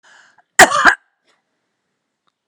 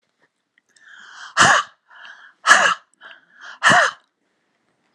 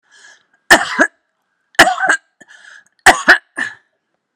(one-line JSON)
{"cough_length": "2.5 s", "cough_amplitude": 32768, "cough_signal_mean_std_ratio": 0.26, "exhalation_length": "4.9 s", "exhalation_amplitude": 32768, "exhalation_signal_mean_std_ratio": 0.34, "three_cough_length": "4.4 s", "three_cough_amplitude": 32768, "three_cough_signal_mean_std_ratio": 0.34, "survey_phase": "beta (2021-08-13 to 2022-03-07)", "age": "65+", "gender": "Female", "wearing_mask": "No", "symptom_none": true, "smoker_status": "Ex-smoker", "respiratory_condition_asthma": false, "respiratory_condition_other": false, "recruitment_source": "Test and Trace", "submission_delay": "2 days", "covid_test_result": "Positive", "covid_test_method": "RT-qPCR", "covid_ct_value": 31.7, "covid_ct_gene": "N gene"}